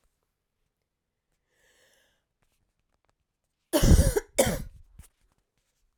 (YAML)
cough_length: 6.0 s
cough_amplitude: 16419
cough_signal_mean_std_ratio: 0.25
survey_phase: alpha (2021-03-01 to 2021-08-12)
age: 18-44
gender: Female
wearing_mask: 'No'
symptom_cough_any: true
symptom_headache: true
smoker_status: Never smoked
respiratory_condition_asthma: false
respiratory_condition_other: false
recruitment_source: Test and Trace
submission_delay: 2 days
covid_test_result: Positive
covid_test_method: RT-qPCR
covid_ct_value: 24.6
covid_ct_gene: N gene